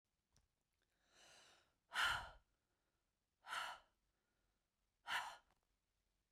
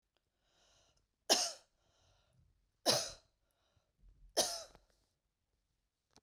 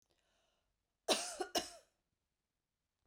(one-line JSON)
{"exhalation_length": "6.3 s", "exhalation_amplitude": 1420, "exhalation_signal_mean_std_ratio": 0.29, "three_cough_length": "6.2 s", "three_cough_amplitude": 6546, "three_cough_signal_mean_std_ratio": 0.25, "cough_length": "3.1 s", "cough_amplitude": 4494, "cough_signal_mean_std_ratio": 0.27, "survey_phase": "beta (2021-08-13 to 2022-03-07)", "age": "45-64", "gender": "Female", "wearing_mask": "No", "symptom_none": true, "smoker_status": "Ex-smoker", "respiratory_condition_asthma": false, "respiratory_condition_other": false, "recruitment_source": "REACT", "submission_delay": "1 day", "covid_test_result": "Negative", "covid_test_method": "RT-qPCR"}